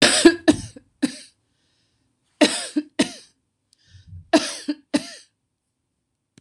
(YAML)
three_cough_length: 6.4 s
three_cough_amplitude: 26028
three_cough_signal_mean_std_ratio: 0.31
survey_phase: beta (2021-08-13 to 2022-03-07)
age: 65+
gender: Female
wearing_mask: 'No'
symptom_none: true
smoker_status: Never smoked
respiratory_condition_asthma: false
respiratory_condition_other: false
recruitment_source: REACT
submission_delay: 2 days
covid_test_result: Negative
covid_test_method: RT-qPCR
influenza_a_test_result: Negative
influenza_b_test_result: Negative